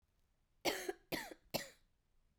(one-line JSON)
{"cough_length": "2.4 s", "cough_amplitude": 2238, "cough_signal_mean_std_ratio": 0.36, "survey_phase": "beta (2021-08-13 to 2022-03-07)", "age": "45-64", "gender": "Female", "wearing_mask": "No", "symptom_cough_any": true, "symptom_runny_or_blocked_nose": true, "symptom_sore_throat": true, "symptom_fatigue": true, "symptom_headache": true, "symptom_onset": "4 days", "smoker_status": "Never smoked", "respiratory_condition_asthma": false, "respiratory_condition_other": false, "recruitment_source": "Test and Trace", "submission_delay": "2 days", "covid_test_result": "Positive", "covid_test_method": "RT-qPCR", "covid_ct_value": 10.7, "covid_ct_gene": "ORF1ab gene"}